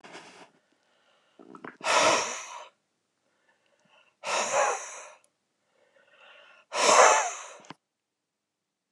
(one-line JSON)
{"exhalation_length": "8.9 s", "exhalation_amplitude": 19410, "exhalation_signal_mean_std_ratio": 0.34, "survey_phase": "beta (2021-08-13 to 2022-03-07)", "age": "65+", "gender": "Male", "wearing_mask": "No", "symptom_none": true, "smoker_status": "Never smoked", "respiratory_condition_asthma": false, "respiratory_condition_other": false, "recruitment_source": "REACT", "submission_delay": "4 days", "covid_test_result": "Negative", "covid_test_method": "RT-qPCR"}